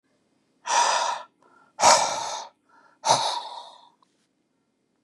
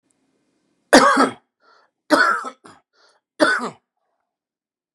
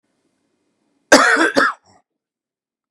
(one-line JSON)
{"exhalation_length": "5.0 s", "exhalation_amplitude": 23637, "exhalation_signal_mean_std_ratio": 0.41, "three_cough_length": "4.9 s", "three_cough_amplitude": 32768, "three_cough_signal_mean_std_ratio": 0.33, "cough_length": "2.9 s", "cough_amplitude": 32768, "cough_signal_mean_std_ratio": 0.33, "survey_phase": "beta (2021-08-13 to 2022-03-07)", "age": "45-64", "gender": "Male", "wearing_mask": "No", "symptom_none": true, "smoker_status": "Never smoked", "respiratory_condition_asthma": false, "respiratory_condition_other": false, "recruitment_source": "REACT", "submission_delay": "2 days", "covid_test_result": "Negative", "covid_test_method": "RT-qPCR", "influenza_a_test_result": "Negative", "influenza_b_test_result": "Negative"}